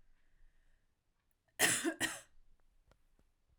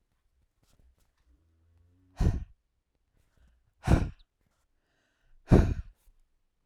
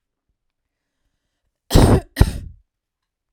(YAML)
three_cough_length: 3.6 s
three_cough_amplitude: 5246
three_cough_signal_mean_std_ratio: 0.3
exhalation_length: 6.7 s
exhalation_amplitude: 15603
exhalation_signal_mean_std_ratio: 0.23
cough_length: 3.3 s
cough_amplitude: 32768
cough_signal_mean_std_ratio: 0.27
survey_phase: alpha (2021-03-01 to 2021-08-12)
age: 18-44
gender: Female
wearing_mask: 'No'
symptom_none: true
smoker_status: Ex-smoker
respiratory_condition_asthma: false
respiratory_condition_other: false
recruitment_source: REACT
submission_delay: 2 days
covid_test_result: Negative
covid_test_method: RT-qPCR